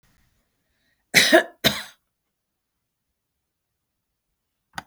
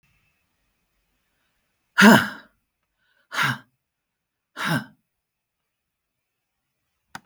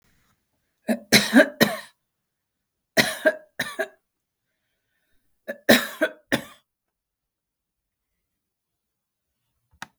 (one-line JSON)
{"cough_length": "4.9 s", "cough_amplitude": 32369, "cough_signal_mean_std_ratio": 0.21, "exhalation_length": "7.3 s", "exhalation_amplitude": 32766, "exhalation_signal_mean_std_ratio": 0.21, "three_cough_length": "10.0 s", "three_cough_amplitude": 32766, "three_cough_signal_mean_std_ratio": 0.25, "survey_phase": "beta (2021-08-13 to 2022-03-07)", "age": "65+", "gender": "Female", "wearing_mask": "No", "symptom_none": true, "smoker_status": "Never smoked", "respiratory_condition_asthma": false, "respiratory_condition_other": false, "recruitment_source": "REACT", "submission_delay": "3 days", "covid_test_result": "Negative", "covid_test_method": "RT-qPCR"}